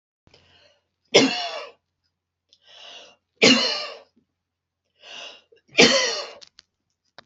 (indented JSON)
{
  "three_cough_length": "7.3 s",
  "three_cough_amplitude": 29547,
  "three_cough_signal_mean_std_ratio": 0.31,
  "survey_phase": "beta (2021-08-13 to 2022-03-07)",
  "age": "45-64",
  "gender": "Female",
  "wearing_mask": "No",
  "symptom_none": true,
  "smoker_status": "Never smoked",
  "respiratory_condition_asthma": false,
  "respiratory_condition_other": false,
  "recruitment_source": "REACT",
  "submission_delay": "2 days",
  "covid_test_result": "Negative",
  "covid_test_method": "RT-qPCR"
}